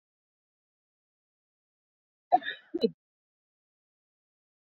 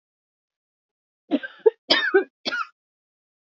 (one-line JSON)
{"cough_length": "4.6 s", "cough_amplitude": 9713, "cough_signal_mean_std_ratio": 0.15, "three_cough_length": "3.6 s", "three_cough_amplitude": 22309, "three_cough_signal_mean_std_ratio": 0.29, "survey_phase": "beta (2021-08-13 to 2022-03-07)", "age": "45-64", "gender": "Female", "wearing_mask": "No", "symptom_none": true, "smoker_status": "Ex-smoker", "respiratory_condition_asthma": false, "respiratory_condition_other": false, "recruitment_source": "REACT", "submission_delay": "1 day", "covid_test_result": "Negative", "covid_test_method": "RT-qPCR", "influenza_a_test_result": "Negative", "influenza_b_test_result": "Negative"}